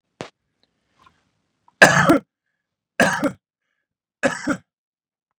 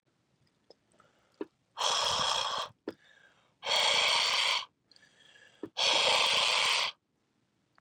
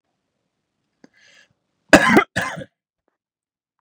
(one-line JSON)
{"three_cough_length": "5.4 s", "three_cough_amplitude": 32768, "three_cough_signal_mean_std_ratio": 0.28, "exhalation_length": "7.8 s", "exhalation_amplitude": 6245, "exhalation_signal_mean_std_ratio": 0.53, "cough_length": "3.8 s", "cough_amplitude": 32768, "cough_signal_mean_std_ratio": 0.23, "survey_phase": "beta (2021-08-13 to 2022-03-07)", "age": "18-44", "gender": "Male", "wearing_mask": "No", "symptom_none": true, "smoker_status": "Ex-smoker", "respiratory_condition_asthma": false, "respiratory_condition_other": false, "recruitment_source": "REACT", "submission_delay": "1 day", "covid_test_result": "Negative", "covid_test_method": "RT-qPCR", "influenza_a_test_result": "Negative", "influenza_b_test_result": "Negative"}